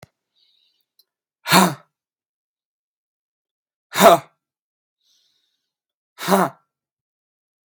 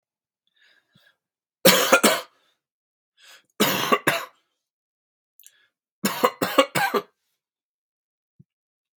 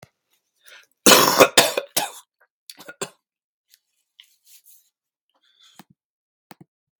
{"exhalation_length": "7.7 s", "exhalation_amplitude": 32768, "exhalation_signal_mean_std_ratio": 0.22, "three_cough_length": "9.0 s", "three_cough_amplitude": 32766, "three_cough_signal_mean_std_ratio": 0.31, "cough_length": "7.0 s", "cough_amplitude": 32768, "cough_signal_mean_std_ratio": 0.23, "survey_phase": "beta (2021-08-13 to 2022-03-07)", "age": "18-44", "gender": "Male", "wearing_mask": "No", "symptom_abdominal_pain": true, "symptom_fatigue": true, "symptom_headache": true, "smoker_status": "Never smoked", "respiratory_condition_asthma": false, "respiratory_condition_other": false, "recruitment_source": "Test and Trace", "submission_delay": "2 days", "covid_test_result": "Positive", "covid_test_method": "RT-qPCR", "covid_ct_value": 21.8, "covid_ct_gene": "N gene"}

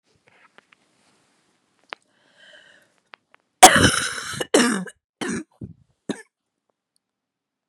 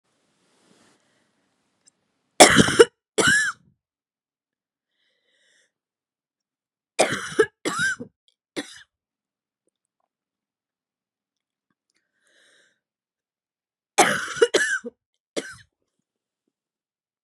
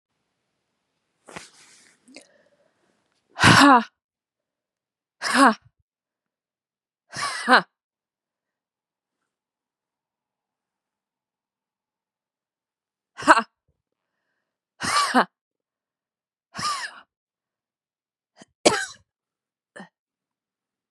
{"cough_length": "7.7 s", "cough_amplitude": 32768, "cough_signal_mean_std_ratio": 0.24, "three_cough_length": "17.2 s", "three_cough_amplitude": 32768, "three_cough_signal_mean_std_ratio": 0.23, "exhalation_length": "20.9 s", "exhalation_amplitude": 32767, "exhalation_signal_mean_std_ratio": 0.22, "survey_phase": "beta (2021-08-13 to 2022-03-07)", "age": "18-44", "gender": "Female", "wearing_mask": "No", "symptom_cough_any": true, "symptom_runny_or_blocked_nose": true, "symptom_sore_throat": true, "symptom_abdominal_pain": true, "symptom_headache": true, "symptom_loss_of_taste": true, "smoker_status": "Never smoked", "respiratory_condition_asthma": false, "respiratory_condition_other": false, "recruitment_source": "Test and Trace", "submission_delay": "-1 day", "covid_test_result": "Positive", "covid_test_method": "LFT"}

